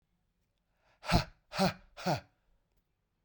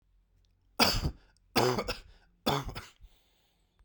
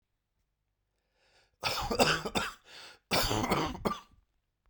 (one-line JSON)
{"exhalation_length": "3.2 s", "exhalation_amplitude": 8642, "exhalation_signal_mean_std_ratio": 0.31, "three_cough_length": "3.8 s", "three_cough_amplitude": 10239, "three_cough_signal_mean_std_ratio": 0.39, "cough_length": "4.7 s", "cough_amplitude": 13790, "cough_signal_mean_std_ratio": 0.46, "survey_phase": "beta (2021-08-13 to 2022-03-07)", "age": "45-64", "gender": "Male", "wearing_mask": "No", "symptom_cough_any": true, "symptom_runny_or_blocked_nose": true, "symptom_shortness_of_breath": true, "symptom_fatigue": true, "symptom_headache": true, "smoker_status": "Never smoked", "respiratory_condition_asthma": false, "respiratory_condition_other": false, "recruitment_source": "Test and Trace", "submission_delay": "2 days", "covid_test_result": "Positive", "covid_test_method": "RT-qPCR", "covid_ct_value": 14.8, "covid_ct_gene": "ORF1ab gene", "covid_ct_mean": 15.2, "covid_viral_load": "10000000 copies/ml", "covid_viral_load_category": "High viral load (>1M copies/ml)"}